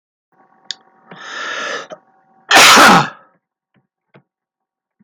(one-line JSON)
{"cough_length": "5.0 s", "cough_amplitude": 32768, "cough_signal_mean_std_ratio": 0.35, "survey_phase": "beta (2021-08-13 to 2022-03-07)", "age": "45-64", "gender": "Male", "wearing_mask": "No", "symptom_runny_or_blocked_nose": true, "smoker_status": "Never smoked", "respiratory_condition_asthma": false, "respiratory_condition_other": false, "recruitment_source": "REACT", "submission_delay": "4 days", "covid_test_result": "Negative", "covid_test_method": "RT-qPCR"}